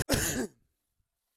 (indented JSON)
{
  "cough_length": "1.4 s",
  "cough_amplitude": 8725,
  "cough_signal_mean_std_ratio": 0.44,
  "survey_phase": "alpha (2021-03-01 to 2021-08-12)",
  "age": "18-44",
  "gender": "Male",
  "wearing_mask": "No",
  "symptom_none": true,
  "smoker_status": "Never smoked",
  "respiratory_condition_asthma": false,
  "respiratory_condition_other": false,
  "recruitment_source": "REACT",
  "submission_delay": "2 days",
  "covid_test_result": "Negative",
  "covid_test_method": "RT-qPCR"
}